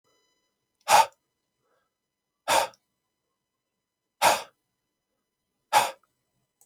{
  "exhalation_length": "6.7 s",
  "exhalation_amplitude": 17183,
  "exhalation_signal_mean_std_ratio": 0.24,
  "survey_phase": "alpha (2021-03-01 to 2021-08-12)",
  "age": "18-44",
  "gender": "Male",
  "wearing_mask": "No",
  "symptom_new_continuous_cough": true,
  "symptom_shortness_of_breath": true,
  "symptom_fever_high_temperature": true,
  "symptom_headache": true,
  "symptom_onset": "3 days",
  "smoker_status": "Never smoked",
  "respiratory_condition_asthma": true,
  "respiratory_condition_other": false,
  "recruitment_source": "Test and Trace",
  "submission_delay": "2 days",
  "covid_test_result": "Positive",
  "covid_test_method": "RT-qPCR",
  "covid_ct_value": 18.2,
  "covid_ct_gene": "ORF1ab gene"
}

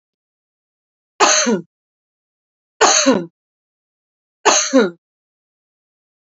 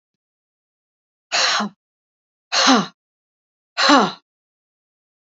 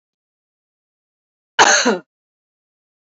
{
  "three_cough_length": "6.3 s",
  "three_cough_amplitude": 32767,
  "three_cough_signal_mean_std_ratio": 0.35,
  "exhalation_length": "5.3 s",
  "exhalation_amplitude": 32572,
  "exhalation_signal_mean_std_ratio": 0.33,
  "cough_length": "3.2 s",
  "cough_amplitude": 30441,
  "cough_signal_mean_std_ratio": 0.26,
  "survey_phase": "beta (2021-08-13 to 2022-03-07)",
  "age": "45-64",
  "gender": "Female",
  "wearing_mask": "No",
  "symptom_none": true,
  "smoker_status": "Never smoked",
  "respiratory_condition_asthma": false,
  "respiratory_condition_other": false,
  "recruitment_source": "REACT",
  "submission_delay": "1 day",
  "covid_test_result": "Negative",
  "covid_test_method": "RT-qPCR"
}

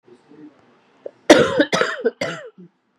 {
  "cough_length": "3.0 s",
  "cough_amplitude": 32768,
  "cough_signal_mean_std_ratio": 0.36,
  "survey_phase": "beta (2021-08-13 to 2022-03-07)",
  "age": "18-44",
  "gender": "Female",
  "wearing_mask": "No",
  "symptom_cough_any": true,
  "symptom_runny_or_blocked_nose": true,
  "symptom_shortness_of_breath": true,
  "symptom_headache": true,
  "symptom_change_to_sense_of_smell_or_taste": true,
  "symptom_onset": "2 days",
  "smoker_status": "Ex-smoker",
  "respiratory_condition_asthma": false,
  "respiratory_condition_other": false,
  "recruitment_source": "Test and Trace",
  "submission_delay": "1 day",
  "covid_test_result": "Positive",
  "covid_test_method": "RT-qPCR",
  "covid_ct_value": 27.6,
  "covid_ct_gene": "ORF1ab gene",
  "covid_ct_mean": 28.2,
  "covid_viral_load": "540 copies/ml",
  "covid_viral_load_category": "Minimal viral load (< 10K copies/ml)"
}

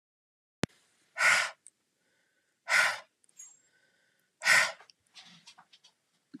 {
  "exhalation_length": "6.4 s",
  "exhalation_amplitude": 11522,
  "exhalation_signal_mean_std_ratio": 0.3,
  "survey_phase": "alpha (2021-03-01 to 2021-08-12)",
  "age": "45-64",
  "gender": "Female",
  "wearing_mask": "No",
  "symptom_fatigue": true,
  "smoker_status": "Never smoked",
  "respiratory_condition_asthma": false,
  "respiratory_condition_other": false,
  "recruitment_source": "REACT",
  "submission_delay": "1 day",
  "covid_test_result": "Negative",
  "covid_test_method": "RT-qPCR"
}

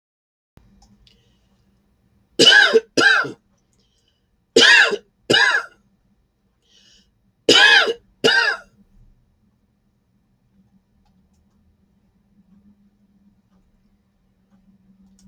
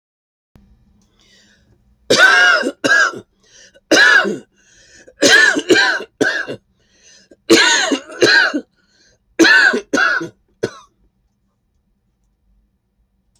{
  "three_cough_length": "15.3 s",
  "three_cough_amplitude": 31876,
  "three_cough_signal_mean_std_ratio": 0.3,
  "cough_length": "13.4 s",
  "cough_amplitude": 32768,
  "cough_signal_mean_std_ratio": 0.46,
  "survey_phase": "beta (2021-08-13 to 2022-03-07)",
  "age": "65+",
  "gender": "Male",
  "wearing_mask": "No",
  "symptom_none": true,
  "smoker_status": "Never smoked",
  "respiratory_condition_asthma": false,
  "respiratory_condition_other": false,
  "recruitment_source": "REACT",
  "submission_delay": "2 days",
  "covid_test_result": "Negative",
  "covid_test_method": "RT-qPCR",
  "influenza_a_test_result": "Negative",
  "influenza_b_test_result": "Negative"
}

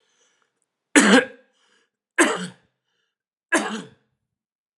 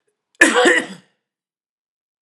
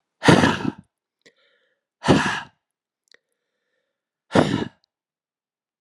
{
  "three_cough_length": "4.8 s",
  "three_cough_amplitude": 32767,
  "three_cough_signal_mean_std_ratio": 0.29,
  "cough_length": "2.2 s",
  "cough_amplitude": 32768,
  "cough_signal_mean_std_ratio": 0.35,
  "exhalation_length": "5.8 s",
  "exhalation_amplitude": 32767,
  "exhalation_signal_mean_std_ratio": 0.3,
  "survey_phase": "alpha (2021-03-01 to 2021-08-12)",
  "age": "45-64",
  "gender": "Male",
  "wearing_mask": "No",
  "symptom_cough_any": true,
  "symptom_headache": true,
  "symptom_onset": "7 days",
  "smoker_status": "Never smoked",
  "respiratory_condition_asthma": false,
  "respiratory_condition_other": false,
  "recruitment_source": "Test and Trace",
  "submission_delay": "2 days",
  "covid_test_result": "Positive",
  "covid_test_method": "RT-qPCR",
  "covid_ct_value": 32.1,
  "covid_ct_gene": "E gene"
}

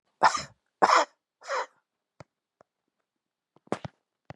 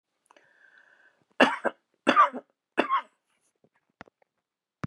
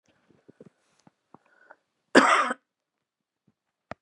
{
  "exhalation_length": "4.4 s",
  "exhalation_amplitude": 21763,
  "exhalation_signal_mean_std_ratio": 0.26,
  "three_cough_length": "4.9 s",
  "three_cough_amplitude": 22192,
  "three_cough_signal_mean_std_ratio": 0.26,
  "cough_length": "4.0 s",
  "cough_amplitude": 25352,
  "cough_signal_mean_std_ratio": 0.22,
  "survey_phase": "beta (2021-08-13 to 2022-03-07)",
  "age": "65+",
  "gender": "Female",
  "wearing_mask": "No",
  "symptom_shortness_of_breath": true,
  "symptom_onset": "12 days",
  "smoker_status": "Ex-smoker",
  "respiratory_condition_asthma": true,
  "respiratory_condition_other": false,
  "recruitment_source": "REACT",
  "submission_delay": "14 days",
  "covid_test_result": "Negative",
  "covid_test_method": "RT-qPCR",
  "influenza_a_test_result": "Negative",
  "influenza_b_test_result": "Negative"
}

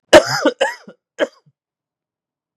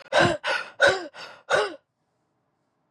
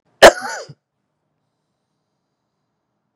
{
  "three_cough_length": "2.6 s",
  "three_cough_amplitude": 32768,
  "three_cough_signal_mean_std_ratio": 0.29,
  "exhalation_length": "2.9 s",
  "exhalation_amplitude": 16762,
  "exhalation_signal_mean_std_ratio": 0.44,
  "cough_length": "3.2 s",
  "cough_amplitude": 32768,
  "cough_signal_mean_std_ratio": 0.17,
  "survey_phase": "beta (2021-08-13 to 2022-03-07)",
  "age": "18-44",
  "gender": "Male",
  "wearing_mask": "No",
  "symptom_cough_any": true,
  "symptom_runny_or_blocked_nose": true,
  "symptom_onset": "3 days",
  "smoker_status": "Ex-smoker",
  "respiratory_condition_asthma": false,
  "respiratory_condition_other": false,
  "recruitment_source": "Test and Trace",
  "submission_delay": "2 days",
  "covid_test_result": "Positive",
  "covid_test_method": "RT-qPCR",
  "covid_ct_value": 14.5,
  "covid_ct_gene": "N gene"
}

